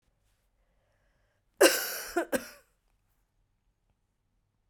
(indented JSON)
{
  "cough_length": "4.7 s",
  "cough_amplitude": 13808,
  "cough_signal_mean_std_ratio": 0.23,
  "survey_phase": "beta (2021-08-13 to 2022-03-07)",
  "age": "45-64",
  "gender": "Female",
  "wearing_mask": "No",
  "symptom_cough_any": true,
  "symptom_new_continuous_cough": true,
  "symptom_runny_or_blocked_nose": true,
  "symptom_sore_throat": true,
  "symptom_fatigue": true,
  "symptom_fever_high_temperature": true,
  "symptom_headache": true,
  "symptom_change_to_sense_of_smell_or_taste": true,
  "symptom_loss_of_taste": true,
  "symptom_onset": "3 days",
  "smoker_status": "Never smoked",
  "respiratory_condition_asthma": false,
  "respiratory_condition_other": false,
  "recruitment_source": "Test and Trace",
  "submission_delay": "1 day",
  "covid_test_result": "Positive",
  "covid_test_method": "RT-qPCR",
  "covid_ct_value": 24.0,
  "covid_ct_gene": "ORF1ab gene",
  "covid_ct_mean": 24.4,
  "covid_viral_load": "9800 copies/ml",
  "covid_viral_load_category": "Minimal viral load (< 10K copies/ml)"
}